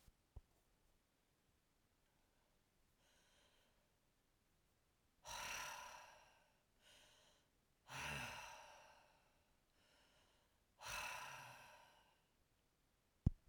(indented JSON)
{
  "exhalation_length": "13.5 s",
  "exhalation_amplitude": 2085,
  "exhalation_signal_mean_std_ratio": 0.32,
  "survey_phase": "alpha (2021-03-01 to 2021-08-12)",
  "age": "65+",
  "gender": "Female",
  "wearing_mask": "No",
  "symptom_none": true,
  "smoker_status": "Ex-smoker",
  "respiratory_condition_asthma": false,
  "respiratory_condition_other": false,
  "recruitment_source": "REACT",
  "submission_delay": "1 day",
  "covid_test_result": "Negative",
  "covid_test_method": "RT-qPCR"
}